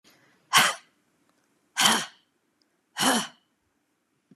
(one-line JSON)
{"exhalation_length": "4.4 s", "exhalation_amplitude": 20753, "exhalation_signal_mean_std_ratio": 0.32, "survey_phase": "beta (2021-08-13 to 2022-03-07)", "age": "45-64", "gender": "Female", "wearing_mask": "No", "symptom_none": true, "smoker_status": "Never smoked", "respiratory_condition_asthma": false, "respiratory_condition_other": false, "recruitment_source": "REACT", "submission_delay": "1 day", "covid_test_result": "Negative", "covid_test_method": "RT-qPCR", "influenza_a_test_result": "Negative", "influenza_b_test_result": "Negative"}